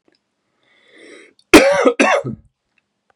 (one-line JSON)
{"cough_length": "3.2 s", "cough_amplitude": 32768, "cough_signal_mean_std_ratio": 0.35, "survey_phase": "beta (2021-08-13 to 2022-03-07)", "age": "18-44", "gender": "Male", "wearing_mask": "No", "symptom_cough_any": true, "symptom_runny_or_blocked_nose": true, "symptom_fatigue": true, "symptom_headache": true, "symptom_change_to_sense_of_smell_or_taste": true, "symptom_other": true, "symptom_onset": "2 days", "smoker_status": "Ex-smoker", "respiratory_condition_asthma": false, "respiratory_condition_other": false, "recruitment_source": "Test and Trace", "submission_delay": "1 day", "covid_test_result": "Positive", "covid_test_method": "RT-qPCR", "covid_ct_value": 19.4, "covid_ct_gene": "ORF1ab gene", "covid_ct_mean": 19.9, "covid_viral_load": "290000 copies/ml", "covid_viral_load_category": "Low viral load (10K-1M copies/ml)"}